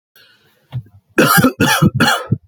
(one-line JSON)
{"three_cough_length": "2.5 s", "three_cough_amplitude": 32768, "three_cough_signal_mean_std_ratio": 0.55, "survey_phase": "beta (2021-08-13 to 2022-03-07)", "age": "18-44", "gender": "Male", "wearing_mask": "No", "symptom_cough_any": true, "symptom_runny_or_blocked_nose": true, "symptom_sore_throat": true, "symptom_onset": "4 days", "smoker_status": "Never smoked", "respiratory_condition_asthma": false, "respiratory_condition_other": false, "recruitment_source": "Test and Trace", "submission_delay": "1 day", "covid_test_result": "Positive", "covid_test_method": "RT-qPCR", "covid_ct_value": 17.6, "covid_ct_gene": "ORF1ab gene"}